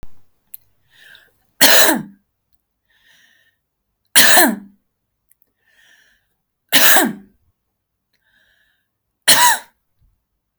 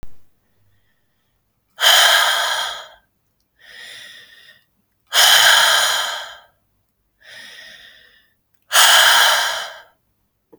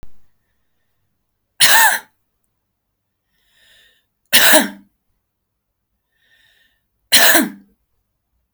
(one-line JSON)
{"cough_length": "10.6 s", "cough_amplitude": 32768, "cough_signal_mean_std_ratio": 0.31, "exhalation_length": "10.6 s", "exhalation_amplitude": 32768, "exhalation_signal_mean_std_ratio": 0.44, "three_cough_length": "8.5 s", "three_cough_amplitude": 32768, "three_cough_signal_mean_std_ratio": 0.29, "survey_phase": "alpha (2021-03-01 to 2021-08-12)", "age": "18-44", "gender": "Female", "wearing_mask": "No", "symptom_none": true, "smoker_status": "Never smoked", "respiratory_condition_asthma": false, "respiratory_condition_other": false, "recruitment_source": "REACT", "submission_delay": "1 day", "covid_test_result": "Negative", "covid_test_method": "RT-qPCR"}